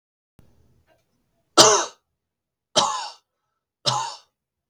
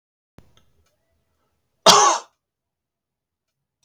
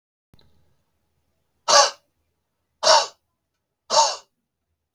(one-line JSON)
{"three_cough_length": "4.7 s", "three_cough_amplitude": 32768, "three_cough_signal_mean_std_ratio": 0.28, "cough_length": "3.8 s", "cough_amplitude": 32768, "cough_signal_mean_std_ratio": 0.22, "exhalation_length": "4.9 s", "exhalation_amplitude": 29964, "exhalation_signal_mean_std_ratio": 0.28, "survey_phase": "beta (2021-08-13 to 2022-03-07)", "age": "65+", "gender": "Male", "wearing_mask": "No", "symptom_none": true, "smoker_status": "Ex-smoker", "respiratory_condition_asthma": false, "respiratory_condition_other": false, "recruitment_source": "REACT", "submission_delay": "1 day", "covid_test_result": "Negative", "covid_test_method": "RT-qPCR", "influenza_a_test_result": "Negative", "influenza_b_test_result": "Negative"}